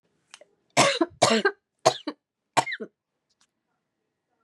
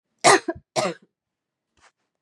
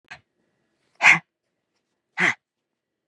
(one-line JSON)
{"three_cough_length": "4.4 s", "three_cough_amplitude": 24546, "three_cough_signal_mean_std_ratio": 0.31, "cough_length": "2.2 s", "cough_amplitude": 29122, "cough_signal_mean_std_ratio": 0.28, "exhalation_length": "3.1 s", "exhalation_amplitude": 28983, "exhalation_signal_mean_std_ratio": 0.23, "survey_phase": "beta (2021-08-13 to 2022-03-07)", "age": "45-64", "gender": "Female", "wearing_mask": "No", "symptom_none": true, "symptom_onset": "3 days", "smoker_status": "Ex-smoker", "respiratory_condition_asthma": false, "respiratory_condition_other": false, "recruitment_source": "Test and Trace", "submission_delay": "2 days", "covid_test_result": "Negative", "covid_test_method": "RT-qPCR"}